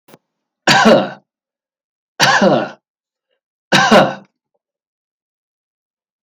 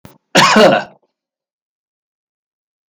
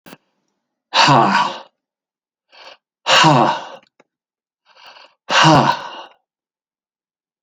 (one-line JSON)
{"three_cough_length": "6.2 s", "three_cough_amplitude": 31465, "three_cough_signal_mean_std_ratio": 0.37, "cough_length": "2.9 s", "cough_amplitude": 32767, "cough_signal_mean_std_ratio": 0.34, "exhalation_length": "7.4 s", "exhalation_amplitude": 31365, "exhalation_signal_mean_std_ratio": 0.39, "survey_phase": "beta (2021-08-13 to 2022-03-07)", "age": "65+", "gender": "Male", "wearing_mask": "No", "symptom_none": true, "smoker_status": "Ex-smoker", "respiratory_condition_asthma": false, "respiratory_condition_other": false, "recruitment_source": "REACT", "submission_delay": "1 day", "covid_test_result": "Negative", "covid_test_method": "RT-qPCR"}